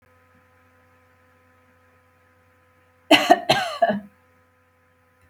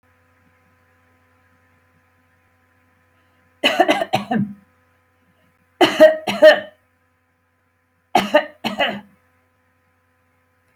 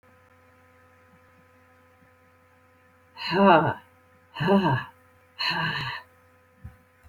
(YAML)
cough_length: 5.3 s
cough_amplitude: 29606
cough_signal_mean_std_ratio: 0.25
three_cough_length: 10.8 s
three_cough_amplitude: 29817
three_cough_signal_mean_std_ratio: 0.28
exhalation_length: 7.1 s
exhalation_amplitude: 20910
exhalation_signal_mean_std_ratio: 0.35
survey_phase: beta (2021-08-13 to 2022-03-07)
age: 65+
gender: Female
wearing_mask: 'No'
symptom_none: true
smoker_status: Never smoked
respiratory_condition_asthma: false
respiratory_condition_other: false
recruitment_source: REACT
submission_delay: 5 days
covid_test_result: Negative
covid_test_method: RT-qPCR